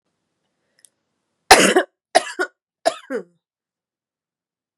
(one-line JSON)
{"three_cough_length": "4.8 s", "three_cough_amplitude": 32768, "three_cough_signal_mean_std_ratio": 0.25, "survey_phase": "beta (2021-08-13 to 2022-03-07)", "age": "18-44", "gender": "Female", "wearing_mask": "No", "symptom_cough_any": true, "symptom_runny_or_blocked_nose": true, "smoker_status": "Ex-smoker", "respiratory_condition_asthma": false, "respiratory_condition_other": false, "recruitment_source": "Test and Trace", "submission_delay": "2 days", "covid_test_result": "Negative", "covid_test_method": "RT-qPCR"}